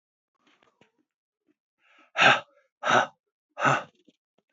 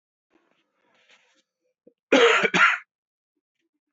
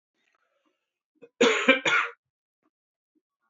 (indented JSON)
{
  "exhalation_length": "4.5 s",
  "exhalation_amplitude": 17898,
  "exhalation_signal_mean_std_ratio": 0.29,
  "cough_length": "3.9 s",
  "cough_amplitude": 18705,
  "cough_signal_mean_std_ratio": 0.31,
  "three_cough_length": "3.5 s",
  "three_cough_amplitude": 20784,
  "three_cough_signal_mean_std_ratio": 0.31,
  "survey_phase": "beta (2021-08-13 to 2022-03-07)",
  "age": "45-64",
  "gender": "Male",
  "wearing_mask": "Yes",
  "symptom_cough_any": true,
  "symptom_new_continuous_cough": true,
  "symptom_runny_or_blocked_nose": true,
  "symptom_sore_throat": true,
  "symptom_fever_high_temperature": true,
  "symptom_headache": true,
  "symptom_change_to_sense_of_smell_or_taste": true,
  "symptom_loss_of_taste": true,
  "symptom_onset": "2 days",
  "smoker_status": "Never smoked",
  "respiratory_condition_asthma": false,
  "respiratory_condition_other": false,
  "recruitment_source": "Test and Trace",
  "submission_delay": "2 days",
  "covid_test_result": "Positive",
  "covid_test_method": "RT-qPCR",
  "covid_ct_value": 21.9,
  "covid_ct_gene": "ORF1ab gene",
  "covid_ct_mean": 22.6,
  "covid_viral_load": "38000 copies/ml",
  "covid_viral_load_category": "Low viral load (10K-1M copies/ml)"
}